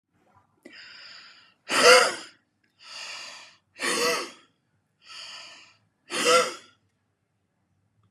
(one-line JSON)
{"exhalation_length": "8.1 s", "exhalation_amplitude": 25058, "exhalation_signal_mean_std_ratio": 0.32, "survey_phase": "beta (2021-08-13 to 2022-03-07)", "age": "45-64", "gender": "Male", "wearing_mask": "No", "symptom_none": true, "smoker_status": "Never smoked", "respiratory_condition_asthma": false, "respiratory_condition_other": false, "recruitment_source": "REACT", "submission_delay": "1 day", "covid_test_result": "Negative", "covid_test_method": "RT-qPCR", "influenza_a_test_result": "Negative", "influenza_b_test_result": "Negative"}